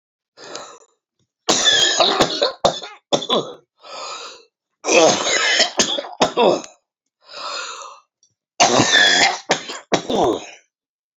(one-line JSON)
{"three_cough_length": "11.2 s", "three_cough_amplitude": 32767, "three_cough_signal_mean_std_ratio": 0.53, "survey_phase": "alpha (2021-03-01 to 2021-08-12)", "age": "45-64", "gender": "Female", "wearing_mask": "No", "symptom_cough_any": true, "symptom_shortness_of_breath": true, "symptom_fatigue": true, "symptom_headache": true, "smoker_status": "Ex-smoker", "respiratory_condition_asthma": false, "respiratory_condition_other": false, "recruitment_source": "REACT", "submission_delay": "1 day", "covid_test_result": "Negative", "covid_test_method": "RT-qPCR"}